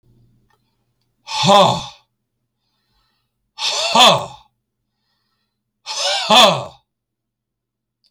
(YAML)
exhalation_length: 8.1 s
exhalation_amplitude: 32768
exhalation_signal_mean_std_ratio: 0.34
survey_phase: beta (2021-08-13 to 2022-03-07)
age: 45-64
gender: Male
wearing_mask: 'No'
symptom_none: true
smoker_status: Never smoked
respiratory_condition_asthma: false
respiratory_condition_other: false
recruitment_source: REACT
submission_delay: 1 day
covid_test_result: Negative
covid_test_method: RT-qPCR